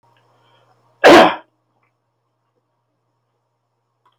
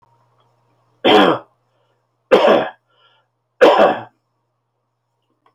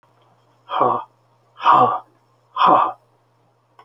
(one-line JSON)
{"cough_length": "4.2 s", "cough_amplitude": 32768, "cough_signal_mean_std_ratio": 0.23, "three_cough_length": "5.5 s", "three_cough_amplitude": 32768, "three_cough_signal_mean_std_ratio": 0.35, "exhalation_length": "3.8 s", "exhalation_amplitude": 26949, "exhalation_signal_mean_std_ratio": 0.41, "survey_phase": "alpha (2021-03-01 to 2021-08-12)", "age": "65+", "gender": "Male", "wearing_mask": "No", "symptom_none": true, "smoker_status": "Never smoked", "respiratory_condition_asthma": false, "respiratory_condition_other": false, "recruitment_source": "REACT", "submission_delay": "2 days", "covid_test_result": "Negative", "covid_test_method": "RT-qPCR"}